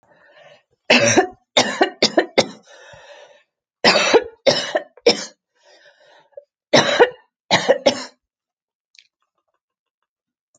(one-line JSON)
{"three_cough_length": "10.6 s", "three_cough_amplitude": 32064, "three_cough_signal_mean_std_ratio": 0.36, "survey_phase": "alpha (2021-03-01 to 2021-08-12)", "age": "65+", "gender": "Female", "wearing_mask": "No", "symptom_cough_any": true, "smoker_status": "Ex-smoker", "respiratory_condition_asthma": true, "respiratory_condition_other": false, "recruitment_source": "REACT", "submission_delay": "3 days", "covid_test_result": "Negative", "covid_test_method": "RT-qPCR"}